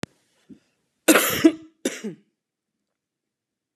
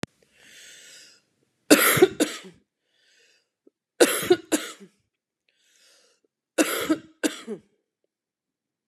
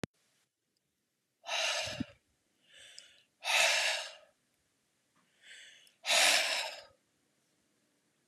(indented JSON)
{
  "cough_length": "3.8 s",
  "cough_amplitude": 31529,
  "cough_signal_mean_std_ratio": 0.27,
  "three_cough_length": "8.9 s",
  "three_cough_amplitude": 31846,
  "three_cough_signal_mean_std_ratio": 0.28,
  "exhalation_length": "8.3 s",
  "exhalation_amplitude": 7250,
  "exhalation_signal_mean_std_ratio": 0.38,
  "survey_phase": "beta (2021-08-13 to 2022-03-07)",
  "age": "45-64",
  "gender": "Female",
  "wearing_mask": "No",
  "symptom_runny_or_blocked_nose": true,
  "smoker_status": "Never smoked",
  "respiratory_condition_asthma": false,
  "respiratory_condition_other": false,
  "recruitment_source": "REACT",
  "submission_delay": "1 day",
  "covid_test_result": "Negative",
  "covid_test_method": "RT-qPCR",
  "influenza_a_test_result": "Negative",
  "influenza_b_test_result": "Negative"
}